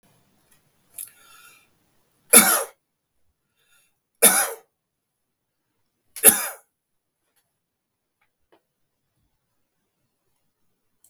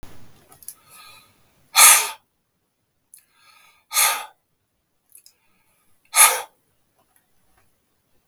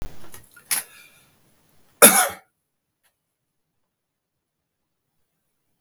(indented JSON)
{
  "three_cough_length": "11.1 s",
  "three_cough_amplitude": 32768,
  "three_cough_signal_mean_std_ratio": 0.19,
  "exhalation_length": "8.3 s",
  "exhalation_amplitude": 32768,
  "exhalation_signal_mean_std_ratio": 0.24,
  "cough_length": "5.8 s",
  "cough_amplitude": 32768,
  "cough_signal_mean_std_ratio": 0.2,
  "survey_phase": "beta (2021-08-13 to 2022-03-07)",
  "age": "65+",
  "gender": "Male",
  "wearing_mask": "No",
  "symptom_none": true,
  "smoker_status": "Ex-smoker",
  "respiratory_condition_asthma": false,
  "respiratory_condition_other": false,
  "recruitment_source": "REACT",
  "submission_delay": "2 days",
  "covid_test_result": "Negative",
  "covid_test_method": "RT-qPCR"
}